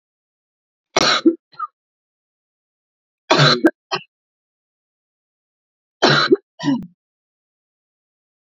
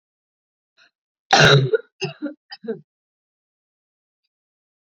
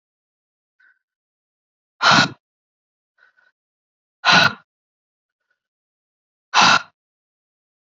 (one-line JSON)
{"three_cough_length": "8.5 s", "three_cough_amplitude": 32768, "three_cough_signal_mean_std_ratio": 0.3, "cough_length": "4.9 s", "cough_amplitude": 32768, "cough_signal_mean_std_ratio": 0.27, "exhalation_length": "7.9 s", "exhalation_amplitude": 29794, "exhalation_signal_mean_std_ratio": 0.25, "survey_phase": "beta (2021-08-13 to 2022-03-07)", "age": "18-44", "gender": "Female", "wearing_mask": "No", "symptom_cough_any": true, "symptom_runny_or_blocked_nose": true, "symptom_shortness_of_breath": true, "symptom_sore_throat": true, "symptom_fatigue": true, "symptom_headache": true, "smoker_status": "Current smoker (1 to 10 cigarettes per day)", "respiratory_condition_asthma": false, "respiratory_condition_other": false, "recruitment_source": "Test and Trace", "submission_delay": "2 days", "covid_test_result": "Positive", "covid_test_method": "LFT"}